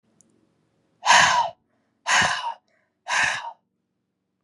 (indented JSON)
{
  "exhalation_length": "4.4 s",
  "exhalation_amplitude": 26234,
  "exhalation_signal_mean_std_ratio": 0.41,
  "survey_phase": "beta (2021-08-13 to 2022-03-07)",
  "age": "18-44",
  "gender": "Female",
  "wearing_mask": "No",
  "symptom_runny_or_blocked_nose": true,
  "symptom_fatigue": true,
  "symptom_change_to_sense_of_smell_or_taste": true,
  "symptom_loss_of_taste": true,
  "symptom_onset": "4 days",
  "smoker_status": "Never smoked",
  "respiratory_condition_asthma": false,
  "respiratory_condition_other": false,
  "recruitment_source": "Test and Trace",
  "submission_delay": "1 day",
  "covid_test_result": "Positive",
  "covid_test_method": "RT-qPCR"
}